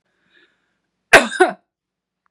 {
  "cough_length": "2.3 s",
  "cough_amplitude": 32768,
  "cough_signal_mean_std_ratio": 0.24,
  "survey_phase": "beta (2021-08-13 to 2022-03-07)",
  "age": "45-64",
  "gender": "Female",
  "wearing_mask": "No",
  "symptom_none": true,
  "symptom_onset": "8 days",
  "smoker_status": "Never smoked",
  "respiratory_condition_asthma": false,
  "respiratory_condition_other": false,
  "recruitment_source": "REACT",
  "submission_delay": "2 days",
  "covid_test_result": "Negative",
  "covid_test_method": "RT-qPCR",
  "influenza_a_test_result": "Negative",
  "influenza_b_test_result": "Negative"
}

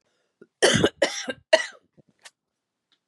{
  "three_cough_length": "3.1 s",
  "three_cough_amplitude": 23631,
  "three_cough_signal_mean_std_ratio": 0.31,
  "survey_phase": "beta (2021-08-13 to 2022-03-07)",
  "age": "45-64",
  "gender": "Female",
  "wearing_mask": "No",
  "symptom_cough_any": true,
  "symptom_runny_or_blocked_nose": true,
  "symptom_shortness_of_breath": true,
  "symptom_headache": true,
  "symptom_onset": "39 days",
  "smoker_status": "Current smoker (1 to 10 cigarettes per day)",
  "respiratory_condition_asthma": false,
  "respiratory_condition_other": false,
  "recruitment_source": "Test and Trace",
  "submission_delay": "2 days",
  "covid_test_result": "Negative",
  "covid_test_method": "ePCR"
}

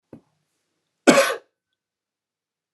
{
  "cough_length": "2.7 s",
  "cough_amplitude": 29204,
  "cough_signal_mean_std_ratio": 0.23,
  "survey_phase": "beta (2021-08-13 to 2022-03-07)",
  "age": "45-64",
  "gender": "Male",
  "wearing_mask": "No",
  "symptom_none": true,
  "smoker_status": "Never smoked",
  "respiratory_condition_asthma": false,
  "respiratory_condition_other": false,
  "recruitment_source": "Test and Trace",
  "submission_delay": "0 days",
  "covid_test_result": "Negative",
  "covid_test_method": "LFT"
}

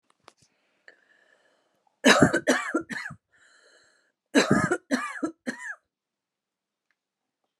{
  "cough_length": "7.6 s",
  "cough_amplitude": 21885,
  "cough_signal_mean_std_ratio": 0.32,
  "survey_phase": "alpha (2021-03-01 to 2021-08-12)",
  "age": "18-44",
  "gender": "Female",
  "wearing_mask": "No",
  "symptom_none": true,
  "smoker_status": "Never smoked",
  "respiratory_condition_asthma": false,
  "respiratory_condition_other": false,
  "recruitment_source": "REACT",
  "submission_delay": "1 day",
  "covid_test_result": "Negative",
  "covid_test_method": "RT-qPCR"
}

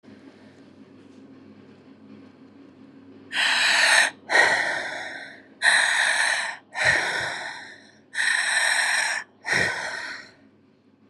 {
  "exhalation_length": "11.1 s",
  "exhalation_amplitude": 19944,
  "exhalation_signal_mean_std_ratio": 0.59,
  "survey_phase": "beta (2021-08-13 to 2022-03-07)",
  "age": "45-64",
  "gender": "Female",
  "wearing_mask": "No",
  "symptom_cough_any": true,
  "symptom_runny_or_blocked_nose": true,
  "symptom_shortness_of_breath": true,
  "symptom_sore_throat": true,
  "symptom_abdominal_pain": true,
  "symptom_headache": true,
  "symptom_change_to_sense_of_smell_or_taste": true,
  "symptom_onset": "5 days",
  "smoker_status": "Never smoked",
  "respiratory_condition_asthma": false,
  "respiratory_condition_other": false,
  "recruitment_source": "REACT",
  "submission_delay": "1 day",
  "covid_test_result": "Negative",
  "covid_test_method": "RT-qPCR",
  "influenza_a_test_result": "Unknown/Void",
  "influenza_b_test_result": "Unknown/Void"
}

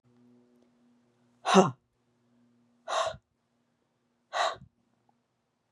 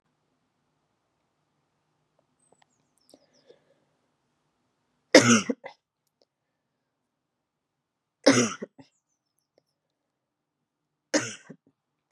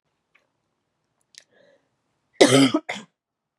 {
  "exhalation_length": "5.7 s",
  "exhalation_amplitude": 19331,
  "exhalation_signal_mean_std_ratio": 0.24,
  "three_cough_length": "12.1 s",
  "three_cough_amplitude": 31358,
  "three_cough_signal_mean_std_ratio": 0.17,
  "cough_length": "3.6 s",
  "cough_amplitude": 32079,
  "cough_signal_mean_std_ratio": 0.25,
  "survey_phase": "beta (2021-08-13 to 2022-03-07)",
  "age": "18-44",
  "gender": "Female",
  "wearing_mask": "No",
  "symptom_cough_any": true,
  "symptom_sore_throat": true,
  "symptom_headache": true,
  "symptom_other": true,
  "smoker_status": "Never smoked",
  "respiratory_condition_asthma": false,
  "respiratory_condition_other": false,
  "recruitment_source": "Test and Trace",
  "submission_delay": "1 day",
  "covid_test_result": "Positive",
  "covid_test_method": "LFT"
}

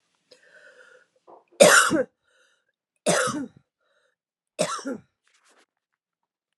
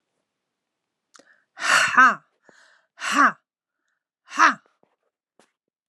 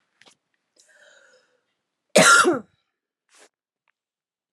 {
  "three_cough_length": "6.6 s",
  "three_cough_amplitude": 30260,
  "three_cough_signal_mean_std_ratio": 0.28,
  "exhalation_length": "5.9 s",
  "exhalation_amplitude": 24465,
  "exhalation_signal_mean_std_ratio": 0.3,
  "cough_length": "4.5 s",
  "cough_amplitude": 28625,
  "cough_signal_mean_std_ratio": 0.25,
  "survey_phase": "alpha (2021-03-01 to 2021-08-12)",
  "age": "45-64",
  "gender": "Male",
  "wearing_mask": "No",
  "symptom_cough_any": true,
  "symptom_fatigue": true,
  "symptom_headache": true,
  "symptom_change_to_sense_of_smell_or_taste": true,
  "symptom_loss_of_taste": true,
  "symptom_onset": "6 days",
  "smoker_status": "Never smoked",
  "respiratory_condition_asthma": false,
  "respiratory_condition_other": false,
  "recruitment_source": "Test and Trace",
  "submission_delay": "2 days",
  "covid_test_result": "Positive",
  "covid_test_method": "RT-qPCR",
  "covid_ct_value": 17.6,
  "covid_ct_gene": "N gene",
  "covid_ct_mean": 17.7,
  "covid_viral_load": "1500000 copies/ml",
  "covid_viral_load_category": "High viral load (>1M copies/ml)"
}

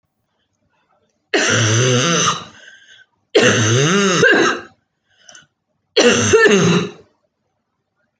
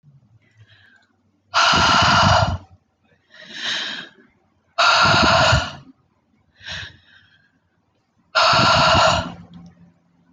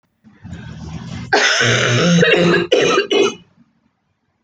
{
  "three_cough_length": "8.2 s",
  "three_cough_amplitude": 29602,
  "three_cough_signal_mean_std_ratio": 0.56,
  "exhalation_length": "10.3 s",
  "exhalation_amplitude": 23343,
  "exhalation_signal_mean_std_ratio": 0.5,
  "cough_length": "4.4 s",
  "cough_amplitude": 29328,
  "cough_signal_mean_std_ratio": 0.66,
  "survey_phase": "alpha (2021-03-01 to 2021-08-12)",
  "age": "18-44",
  "gender": "Female",
  "wearing_mask": "No",
  "symptom_abdominal_pain": true,
  "smoker_status": "Ex-smoker",
  "respiratory_condition_asthma": false,
  "respiratory_condition_other": false,
  "recruitment_source": "REACT",
  "submission_delay": "2 days",
  "covid_test_result": "Negative",
  "covid_test_method": "RT-qPCR"
}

